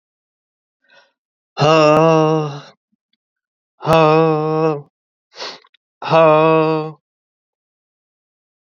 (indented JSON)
{
  "exhalation_length": "8.6 s",
  "exhalation_amplitude": 30178,
  "exhalation_signal_mean_std_ratio": 0.45,
  "survey_phase": "beta (2021-08-13 to 2022-03-07)",
  "age": "18-44",
  "gender": "Male",
  "wearing_mask": "No",
  "symptom_cough_any": true,
  "symptom_new_continuous_cough": true,
  "symptom_runny_or_blocked_nose": true,
  "symptom_shortness_of_breath": true,
  "symptom_sore_throat": true,
  "symptom_fatigue": true,
  "symptom_headache": true,
  "symptom_onset": "4 days",
  "smoker_status": "Never smoked",
  "respiratory_condition_asthma": true,
  "respiratory_condition_other": false,
  "recruitment_source": "Test and Trace",
  "submission_delay": "1 day",
  "covid_test_result": "Positive",
  "covid_test_method": "RT-qPCR",
  "covid_ct_value": 25.3,
  "covid_ct_gene": "ORF1ab gene"
}